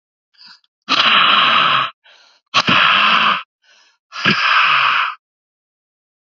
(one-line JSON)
{"exhalation_length": "6.3 s", "exhalation_amplitude": 29390, "exhalation_signal_mean_std_ratio": 0.6, "survey_phase": "beta (2021-08-13 to 2022-03-07)", "age": "45-64", "gender": "Male", "wearing_mask": "No", "symptom_cough_any": true, "symptom_runny_or_blocked_nose": true, "symptom_sore_throat": true, "symptom_diarrhoea": true, "symptom_fatigue": true, "symptom_fever_high_temperature": true, "symptom_headache": true, "symptom_loss_of_taste": true, "symptom_onset": "3 days", "smoker_status": "Never smoked", "respiratory_condition_asthma": false, "respiratory_condition_other": false, "recruitment_source": "Test and Trace", "submission_delay": "2 days", "covid_test_result": "Positive", "covid_test_method": "RT-qPCR"}